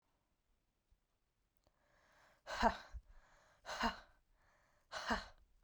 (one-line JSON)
{"exhalation_length": "5.6 s", "exhalation_amplitude": 3512, "exhalation_signal_mean_std_ratio": 0.3, "survey_phase": "alpha (2021-03-01 to 2021-08-12)", "age": "18-44", "gender": "Female", "wearing_mask": "No", "symptom_cough_any": true, "symptom_shortness_of_breath": true, "symptom_fatigue": true, "symptom_headache": true, "symptom_loss_of_taste": true, "symptom_onset": "3 days", "smoker_status": "Ex-smoker", "respiratory_condition_asthma": false, "respiratory_condition_other": false, "recruitment_source": "Test and Trace", "submission_delay": "2 days", "covid_test_result": "Positive", "covid_test_method": "RT-qPCR", "covid_ct_value": 16.7, "covid_ct_gene": "ORF1ab gene", "covid_ct_mean": 17.3, "covid_viral_load": "2100000 copies/ml", "covid_viral_load_category": "High viral load (>1M copies/ml)"}